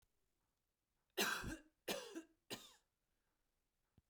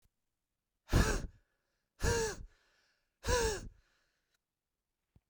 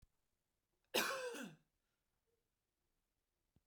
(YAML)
three_cough_length: 4.1 s
three_cough_amplitude: 1615
three_cough_signal_mean_std_ratio: 0.33
exhalation_length: 5.3 s
exhalation_amplitude: 5740
exhalation_signal_mean_std_ratio: 0.35
cough_length: 3.7 s
cough_amplitude: 2157
cough_signal_mean_std_ratio: 0.29
survey_phase: beta (2021-08-13 to 2022-03-07)
age: 18-44
gender: Female
wearing_mask: 'No'
symptom_runny_or_blocked_nose: true
symptom_headache: true
symptom_other: true
smoker_status: Never smoked
respiratory_condition_asthma: false
respiratory_condition_other: false
recruitment_source: Test and Trace
submission_delay: 0 days
covid_test_result: Positive
covid_test_method: LFT